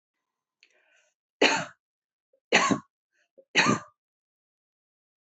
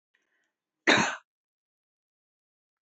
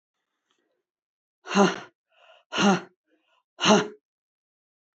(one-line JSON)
{"three_cough_length": "5.2 s", "three_cough_amplitude": 16996, "three_cough_signal_mean_std_ratio": 0.28, "cough_length": "2.8 s", "cough_amplitude": 15438, "cough_signal_mean_std_ratio": 0.23, "exhalation_length": "4.9 s", "exhalation_amplitude": 20095, "exhalation_signal_mean_std_ratio": 0.31, "survey_phase": "beta (2021-08-13 to 2022-03-07)", "age": "45-64", "gender": "Female", "wearing_mask": "No", "symptom_none": true, "symptom_onset": "6 days", "smoker_status": "Never smoked", "respiratory_condition_asthma": false, "respiratory_condition_other": false, "recruitment_source": "REACT", "submission_delay": "1 day", "covid_test_result": "Negative", "covid_test_method": "RT-qPCR"}